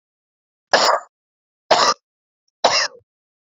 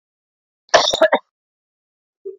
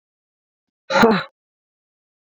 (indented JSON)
{
  "three_cough_length": "3.5 s",
  "three_cough_amplitude": 31618,
  "three_cough_signal_mean_std_ratio": 0.36,
  "cough_length": "2.4 s",
  "cough_amplitude": 28012,
  "cough_signal_mean_std_ratio": 0.3,
  "exhalation_length": "2.4 s",
  "exhalation_amplitude": 32767,
  "exhalation_signal_mean_std_ratio": 0.28,
  "survey_phase": "beta (2021-08-13 to 2022-03-07)",
  "age": "45-64",
  "gender": "Female",
  "wearing_mask": "No",
  "symptom_cough_any": true,
  "symptom_new_continuous_cough": true,
  "symptom_fatigue": true,
  "symptom_headache": true,
  "symptom_change_to_sense_of_smell_or_taste": true,
  "symptom_loss_of_taste": true,
  "symptom_onset": "4 days",
  "smoker_status": "Never smoked",
  "respiratory_condition_asthma": false,
  "respiratory_condition_other": false,
  "recruitment_source": "Test and Trace",
  "submission_delay": "2 days",
  "covid_test_result": "Positive",
  "covid_test_method": "RT-qPCR"
}